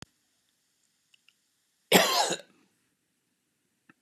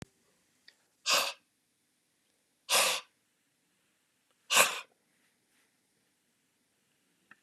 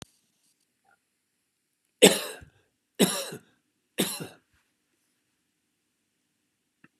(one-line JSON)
{"cough_length": "4.0 s", "cough_amplitude": 18742, "cough_signal_mean_std_ratio": 0.24, "exhalation_length": "7.4 s", "exhalation_amplitude": 18819, "exhalation_signal_mean_std_ratio": 0.25, "three_cough_length": "7.0 s", "three_cough_amplitude": 26652, "three_cough_signal_mean_std_ratio": 0.19, "survey_phase": "beta (2021-08-13 to 2022-03-07)", "age": "65+", "gender": "Male", "wearing_mask": "No", "symptom_none": true, "smoker_status": "Ex-smoker", "respiratory_condition_asthma": false, "respiratory_condition_other": false, "recruitment_source": "REACT", "submission_delay": "3 days", "covid_test_result": "Negative", "covid_test_method": "RT-qPCR", "influenza_a_test_result": "Negative", "influenza_b_test_result": "Negative"}